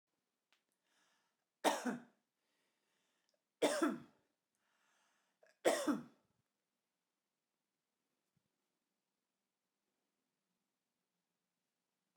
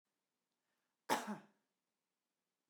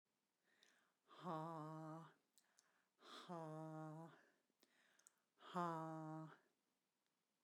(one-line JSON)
{"three_cough_length": "12.2 s", "three_cough_amplitude": 3598, "three_cough_signal_mean_std_ratio": 0.22, "cough_length": "2.7 s", "cough_amplitude": 2912, "cough_signal_mean_std_ratio": 0.22, "exhalation_length": "7.4 s", "exhalation_amplitude": 783, "exhalation_signal_mean_std_ratio": 0.49, "survey_phase": "beta (2021-08-13 to 2022-03-07)", "age": "18-44", "gender": "Female", "wearing_mask": "No", "symptom_none": true, "symptom_onset": "4 days", "smoker_status": "Current smoker (1 to 10 cigarettes per day)", "respiratory_condition_asthma": false, "respiratory_condition_other": false, "recruitment_source": "REACT", "submission_delay": "1 day", "covid_test_result": "Negative", "covid_test_method": "RT-qPCR"}